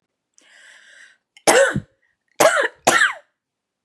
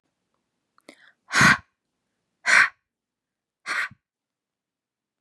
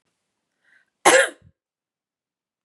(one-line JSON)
{"three_cough_length": "3.8 s", "three_cough_amplitude": 32597, "three_cough_signal_mean_std_ratio": 0.37, "exhalation_length": "5.2 s", "exhalation_amplitude": 24899, "exhalation_signal_mean_std_ratio": 0.26, "cough_length": "2.6 s", "cough_amplitude": 31787, "cough_signal_mean_std_ratio": 0.22, "survey_phase": "beta (2021-08-13 to 2022-03-07)", "age": "18-44", "gender": "Female", "wearing_mask": "No", "symptom_none": true, "smoker_status": "Never smoked", "respiratory_condition_asthma": false, "respiratory_condition_other": false, "recruitment_source": "REACT", "submission_delay": "1 day", "covid_test_result": "Negative", "covid_test_method": "RT-qPCR", "influenza_a_test_result": "Unknown/Void", "influenza_b_test_result": "Unknown/Void"}